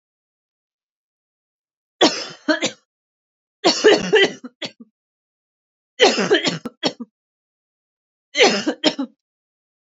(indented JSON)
{
  "three_cough_length": "9.8 s",
  "three_cough_amplitude": 29618,
  "three_cough_signal_mean_std_ratio": 0.34,
  "survey_phase": "beta (2021-08-13 to 2022-03-07)",
  "age": "18-44",
  "gender": "Female",
  "wearing_mask": "No",
  "symptom_cough_any": true,
  "symptom_runny_or_blocked_nose": true,
  "symptom_shortness_of_breath": true,
  "symptom_sore_throat": true,
  "symptom_fatigue": true,
  "symptom_change_to_sense_of_smell_or_taste": true,
  "symptom_loss_of_taste": true,
  "smoker_status": "Ex-smoker",
  "respiratory_condition_asthma": false,
  "respiratory_condition_other": false,
  "recruitment_source": "Test and Trace",
  "submission_delay": "4 days",
  "covid_test_result": "Positive",
  "covid_test_method": "RT-qPCR",
  "covid_ct_value": 27.8,
  "covid_ct_gene": "ORF1ab gene",
  "covid_ct_mean": 28.5,
  "covid_viral_load": "450 copies/ml",
  "covid_viral_load_category": "Minimal viral load (< 10K copies/ml)"
}